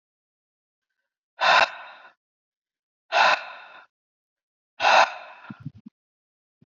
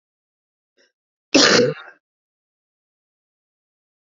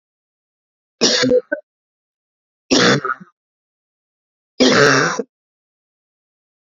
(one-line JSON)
{"exhalation_length": "6.7 s", "exhalation_amplitude": 20556, "exhalation_signal_mean_std_ratio": 0.3, "cough_length": "4.2 s", "cough_amplitude": 30961, "cough_signal_mean_std_ratio": 0.24, "three_cough_length": "6.7 s", "three_cough_amplitude": 31283, "three_cough_signal_mean_std_ratio": 0.37, "survey_phase": "beta (2021-08-13 to 2022-03-07)", "age": "45-64", "gender": "Female", "wearing_mask": "No", "symptom_cough_any": true, "symptom_sore_throat": true, "symptom_fatigue": true, "symptom_change_to_sense_of_smell_or_taste": true, "smoker_status": "Current smoker (e-cigarettes or vapes only)", "respiratory_condition_asthma": false, "respiratory_condition_other": false, "recruitment_source": "Test and Trace", "submission_delay": "1 day", "covid_test_result": "Positive", "covid_test_method": "RT-qPCR", "covid_ct_value": 18.6, "covid_ct_gene": "N gene"}